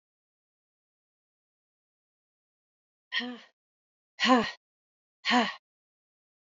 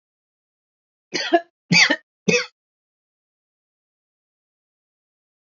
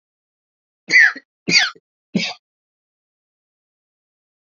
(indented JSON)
{
  "exhalation_length": "6.5 s",
  "exhalation_amplitude": 12050,
  "exhalation_signal_mean_std_ratio": 0.24,
  "cough_length": "5.5 s",
  "cough_amplitude": 28195,
  "cough_signal_mean_std_ratio": 0.24,
  "three_cough_length": "4.5 s",
  "three_cough_amplitude": 30063,
  "three_cough_signal_mean_std_ratio": 0.27,
  "survey_phase": "beta (2021-08-13 to 2022-03-07)",
  "age": "45-64",
  "gender": "Female",
  "wearing_mask": "No",
  "symptom_cough_any": true,
  "symptom_runny_or_blocked_nose": true,
  "symptom_shortness_of_breath": true,
  "symptom_sore_throat": true,
  "symptom_diarrhoea": true,
  "symptom_fatigue": true,
  "symptom_onset": "12 days",
  "smoker_status": "Never smoked",
  "respiratory_condition_asthma": true,
  "respiratory_condition_other": false,
  "recruitment_source": "REACT",
  "submission_delay": "0 days",
  "covid_test_result": "Negative",
  "covid_test_method": "RT-qPCR",
  "influenza_a_test_result": "Negative",
  "influenza_b_test_result": "Negative"
}